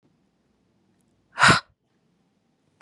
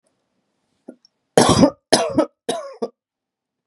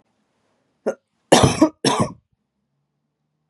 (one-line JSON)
{"exhalation_length": "2.8 s", "exhalation_amplitude": 26375, "exhalation_signal_mean_std_ratio": 0.21, "three_cough_length": "3.7 s", "three_cough_amplitude": 32768, "three_cough_signal_mean_std_ratio": 0.34, "cough_length": "3.5 s", "cough_amplitude": 32767, "cough_signal_mean_std_ratio": 0.3, "survey_phase": "beta (2021-08-13 to 2022-03-07)", "age": "18-44", "gender": "Female", "wearing_mask": "No", "symptom_cough_any": true, "symptom_runny_or_blocked_nose": true, "symptom_sore_throat": true, "symptom_fatigue": true, "symptom_headache": true, "symptom_onset": "4 days", "smoker_status": "Ex-smoker", "respiratory_condition_asthma": false, "respiratory_condition_other": false, "recruitment_source": "Test and Trace", "submission_delay": "1 day", "covid_test_result": "Positive", "covid_test_method": "RT-qPCR", "covid_ct_value": 26.6, "covid_ct_gene": "N gene"}